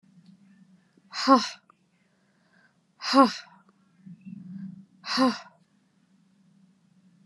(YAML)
exhalation_length: 7.3 s
exhalation_amplitude: 23494
exhalation_signal_mean_std_ratio: 0.26
survey_phase: beta (2021-08-13 to 2022-03-07)
age: 18-44
gender: Female
wearing_mask: 'No'
symptom_runny_or_blocked_nose: true
symptom_fatigue: true
symptom_headache: true
symptom_change_to_sense_of_smell_or_taste: true
symptom_onset: 5 days
smoker_status: Never smoked
respiratory_condition_asthma: false
respiratory_condition_other: false
recruitment_source: Test and Trace
submission_delay: 2 days
covid_test_result: Positive
covid_test_method: RT-qPCR